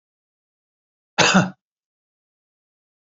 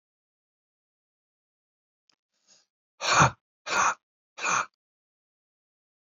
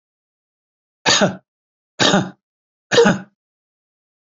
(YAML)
cough_length: 3.2 s
cough_amplitude: 27948
cough_signal_mean_std_ratio: 0.23
exhalation_length: 6.1 s
exhalation_amplitude: 14316
exhalation_signal_mean_std_ratio: 0.26
three_cough_length: 4.4 s
three_cough_amplitude: 29528
three_cough_signal_mean_std_ratio: 0.33
survey_phase: beta (2021-08-13 to 2022-03-07)
age: 65+
gender: Male
wearing_mask: 'No'
symptom_none: true
smoker_status: Never smoked
respiratory_condition_asthma: true
respiratory_condition_other: false
recruitment_source: REACT
submission_delay: 2 days
covid_test_result: Negative
covid_test_method: RT-qPCR
influenza_a_test_result: Negative
influenza_b_test_result: Negative